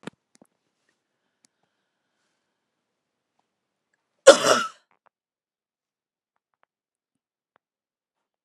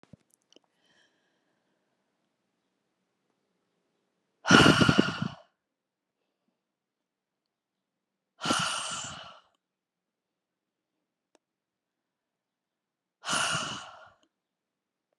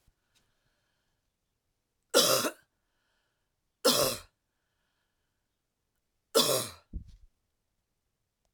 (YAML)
cough_length: 8.4 s
cough_amplitude: 32768
cough_signal_mean_std_ratio: 0.12
exhalation_length: 15.2 s
exhalation_amplitude: 27356
exhalation_signal_mean_std_ratio: 0.22
three_cough_length: 8.5 s
three_cough_amplitude: 12303
three_cough_signal_mean_std_ratio: 0.27
survey_phase: alpha (2021-03-01 to 2021-08-12)
age: 45-64
gender: Female
wearing_mask: 'No'
symptom_headache: true
smoker_status: Never smoked
respiratory_condition_asthma: true
respiratory_condition_other: false
recruitment_source: Test and Trace
submission_delay: 2 days
covid_test_result: Positive
covid_test_method: RT-qPCR
covid_ct_value: 36.8
covid_ct_gene: N gene